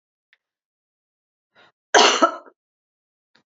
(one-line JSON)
{"cough_length": "3.6 s", "cough_amplitude": 29801, "cough_signal_mean_std_ratio": 0.24, "survey_phase": "beta (2021-08-13 to 2022-03-07)", "age": "45-64", "gender": "Female", "wearing_mask": "No", "symptom_cough_any": true, "symptom_runny_or_blocked_nose": true, "symptom_other": true, "smoker_status": "Never smoked", "respiratory_condition_asthma": false, "respiratory_condition_other": false, "recruitment_source": "Test and Trace", "submission_delay": "2 days", "covid_test_result": "Positive", "covid_test_method": "LFT"}